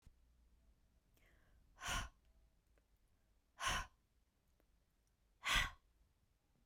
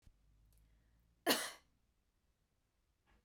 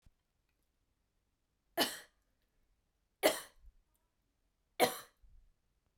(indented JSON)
{
  "exhalation_length": "6.7 s",
  "exhalation_amplitude": 2416,
  "exhalation_signal_mean_std_ratio": 0.29,
  "cough_length": "3.2 s",
  "cough_amplitude": 3513,
  "cough_signal_mean_std_ratio": 0.22,
  "three_cough_length": "6.0 s",
  "three_cough_amplitude": 6963,
  "three_cough_signal_mean_std_ratio": 0.21,
  "survey_phase": "beta (2021-08-13 to 2022-03-07)",
  "age": "18-44",
  "gender": "Female",
  "wearing_mask": "No",
  "symptom_none": true,
  "smoker_status": "Never smoked",
  "respiratory_condition_asthma": false,
  "respiratory_condition_other": false,
  "recruitment_source": "REACT",
  "submission_delay": "8 days",
  "covid_test_result": "Negative",
  "covid_test_method": "RT-qPCR",
  "influenza_a_test_result": "Negative",
  "influenza_b_test_result": "Negative"
}